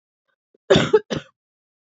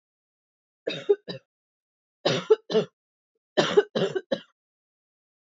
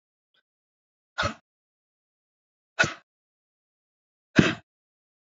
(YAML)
cough_length: 1.9 s
cough_amplitude: 25086
cough_signal_mean_std_ratio: 0.3
three_cough_length: 5.5 s
three_cough_amplitude: 16117
three_cough_signal_mean_std_ratio: 0.31
exhalation_length: 5.4 s
exhalation_amplitude: 27653
exhalation_signal_mean_std_ratio: 0.18
survey_phase: beta (2021-08-13 to 2022-03-07)
age: 18-44
gender: Female
wearing_mask: 'No'
symptom_runny_or_blocked_nose: true
symptom_fatigue: true
smoker_status: Current smoker (1 to 10 cigarettes per day)
respiratory_condition_asthma: false
respiratory_condition_other: false
recruitment_source: Test and Trace
submission_delay: 1 day
covid_test_result: Positive
covid_test_method: RT-qPCR
covid_ct_value: 19.4
covid_ct_gene: ORF1ab gene